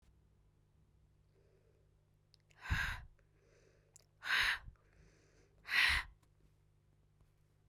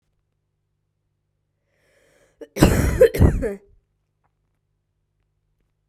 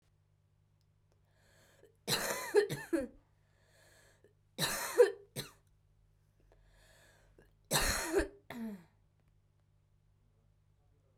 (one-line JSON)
{"exhalation_length": "7.7 s", "exhalation_amplitude": 3330, "exhalation_signal_mean_std_ratio": 0.31, "cough_length": "5.9 s", "cough_amplitude": 32768, "cough_signal_mean_std_ratio": 0.28, "three_cough_length": "11.2 s", "three_cough_amplitude": 7021, "three_cough_signal_mean_std_ratio": 0.31, "survey_phase": "beta (2021-08-13 to 2022-03-07)", "age": "18-44", "gender": "Female", "wearing_mask": "No", "symptom_cough_any": true, "symptom_runny_or_blocked_nose": true, "symptom_sore_throat": true, "symptom_fatigue": true, "symptom_headache": true, "symptom_change_to_sense_of_smell_or_taste": true, "symptom_loss_of_taste": true, "smoker_status": "Never smoked", "respiratory_condition_asthma": false, "respiratory_condition_other": false, "recruitment_source": "Test and Trace", "submission_delay": "2 days", "covid_test_result": "Positive", "covid_test_method": "RT-qPCR"}